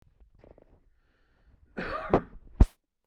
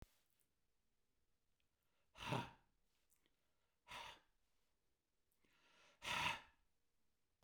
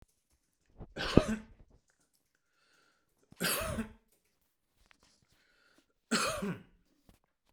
{"cough_length": "3.1 s", "cough_amplitude": 17155, "cough_signal_mean_std_ratio": 0.22, "exhalation_length": "7.4 s", "exhalation_amplitude": 1349, "exhalation_signal_mean_std_ratio": 0.28, "three_cough_length": "7.5 s", "three_cough_amplitude": 17953, "three_cough_signal_mean_std_ratio": 0.28, "survey_phase": "beta (2021-08-13 to 2022-03-07)", "age": "45-64", "gender": "Male", "wearing_mask": "No", "symptom_cough_any": true, "smoker_status": "Ex-smoker", "respiratory_condition_asthma": false, "respiratory_condition_other": false, "recruitment_source": "REACT", "submission_delay": "3 days", "covid_test_result": "Negative", "covid_test_method": "RT-qPCR", "influenza_a_test_result": "Negative", "influenza_b_test_result": "Negative"}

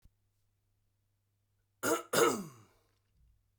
{"cough_length": "3.6 s", "cough_amplitude": 7120, "cough_signal_mean_std_ratio": 0.29, "survey_phase": "beta (2021-08-13 to 2022-03-07)", "age": "18-44", "gender": "Male", "wearing_mask": "No", "symptom_none": true, "smoker_status": "Never smoked", "respiratory_condition_asthma": false, "respiratory_condition_other": false, "recruitment_source": "REACT", "submission_delay": "1 day", "covid_test_result": "Negative", "covid_test_method": "RT-qPCR"}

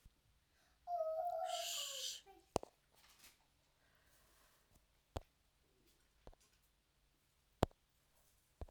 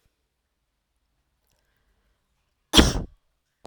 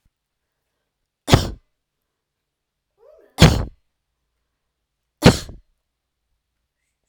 {"exhalation_length": "8.7 s", "exhalation_amplitude": 4953, "exhalation_signal_mean_std_ratio": 0.34, "cough_length": "3.7 s", "cough_amplitude": 32768, "cough_signal_mean_std_ratio": 0.18, "three_cough_length": "7.1 s", "three_cough_amplitude": 32768, "three_cough_signal_mean_std_ratio": 0.19, "survey_phase": "beta (2021-08-13 to 2022-03-07)", "age": "18-44", "gender": "Female", "wearing_mask": "No", "symptom_none": true, "smoker_status": "Ex-smoker", "respiratory_condition_asthma": false, "respiratory_condition_other": false, "recruitment_source": "REACT", "submission_delay": "5 days", "covid_test_result": "Negative", "covid_test_method": "RT-qPCR"}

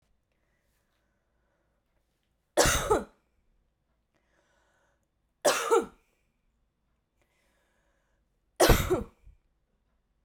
{"three_cough_length": "10.2 s", "three_cough_amplitude": 12651, "three_cough_signal_mean_std_ratio": 0.26, "survey_phase": "beta (2021-08-13 to 2022-03-07)", "age": "18-44", "gender": "Female", "wearing_mask": "No", "symptom_cough_any": true, "smoker_status": "Never smoked", "respiratory_condition_asthma": false, "respiratory_condition_other": false, "recruitment_source": "REACT", "submission_delay": "2 days", "covid_test_result": "Negative", "covid_test_method": "RT-qPCR"}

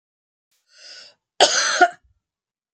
{"cough_length": "2.7 s", "cough_amplitude": 31829, "cough_signal_mean_std_ratio": 0.31, "survey_phase": "beta (2021-08-13 to 2022-03-07)", "age": "45-64", "gender": "Female", "wearing_mask": "No", "symptom_none": true, "smoker_status": "Ex-smoker", "respiratory_condition_asthma": false, "respiratory_condition_other": false, "recruitment_source": "REACT", "submission_delay": "1 day", "covid_test_result": "Negative", "covid_test_method": "RT-qPCR", "influenza_a_test_result": "Negative", "influenza_b_test_result": "Negative"}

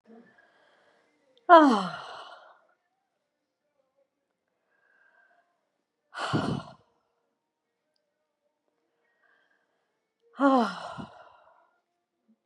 {"exhalation_length": "12.5 s", "exhalation_amplitude": 24875, "exhalation_signal_mean_std_ratio": 0.21, "survey_phase": "beta (2021-08-13 to 2022-03-07)", "age": "45-64", "gender": "Female", "wearing_mask": "No", "symptom_none": true, "smoker_status": "Ex-smoker", "respiratory_condition_asthma": false, "respiratory_condition_other": false, "recruitment_source": "REACT", "submission_delay": "1 day", "covid_test_result": "Negative", "covid_test_method": "RT-qPCR", "influenza_a_test_result": "Negative", "influenza_b_test_result": "Negative"}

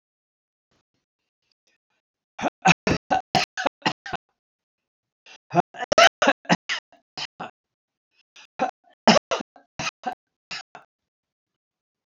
{"three_cough_length": "12.2 s", "three_cough_amplitude": 28336, "three_cough_signal_mean_std_ratio": 0.25, "survey_phase": "alpha (2021-03-01 to 2021-08-12)", "age": "65+", "gender": "Male", "wearing_mask": "No", "symptom_none": true, "smoker_status": "Ex-smoker", "respiratory_condition_asthma": false, "respiratory_condition_other": false, "recruitment_source": "REACT", "submission_delay": "1 day", "covid_test_result": "Negative", "covid_test_method": "RT-qPCR"}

